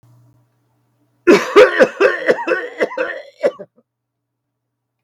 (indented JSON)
{
  "cough_length": "5.0 s",
  "cough_amplitude": 32768,
  "cough_signal_mean_std_ratio": 0.39,
  "survey_phase": "beta (2021-08-13 to 2022-03-07)",
  "age": "45-64",
  "gender": "Male",
  "wearing_mask": "No",
  "symptom_none": true,
  "smoker_status": "Never smoked",
  "respiratory_condition_asthma": false,
  "respiratory_condition_other": false,
  "recruitment_source": "REACT",
  "submission_delay": "1 day",
  "covid_test_result": "Negative",
  "covid_test_method": "RT-qPCR",
  "influenza_a_test_result": "Negative",
  "influenza_b_test_result": "Negative"
}